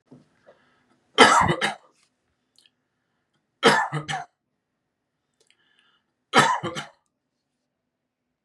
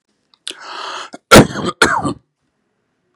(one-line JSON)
{"three_cough_length": "8.4 s", "three_cough_amplitude": 31574, "three_cough_signal_mean_std_ratio": 0.28, "cough_length": "3.2 s", "cough_amplitude": 32768, "cough_signal_mean_std_ratio": 0.33, "survey_phase": "beta (2021-08-13 to 2022-03-07)", "age": "18-44", "gender": "Male", "wearing_mask": "No", "symptom_cough_any": true, "symptom_runny_or_blocked_nose": true, "symptom_sore_throat": true, "symptom_onset": "5 days", "smoker_status": "Never smoked", "respiratory_condition_asthma": false, "respiratory_condition_other": false, "recruitment_source": "REACT", "submission_delay": "1 day", "covid_test_result": "Negative", "covid_test_method": "RT-qPCR"}